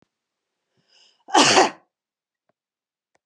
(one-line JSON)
{"cough_length": "3.3 s", "cough_amplitude": 28534, "cough_signal_mean_std_ratio": 0.27, "survey_phase": "beta (2021-08-13 to 2022-03-07)", "age": "45-64", "gender": "Female", "wearing_mask": "No", "symptom_none": true, "smoker_status": "Never smoked", "respiratory_condition_asthma": false, "respiratory_condition_other": false, "recruitment_source": "REACT", "submission_delay": "2 days", "covid_test_result": "Negative", "covid_test_method": "RT-qPCR", "influenza_a_test_result": "Negative", "influenza_b_test_result": "Negative"}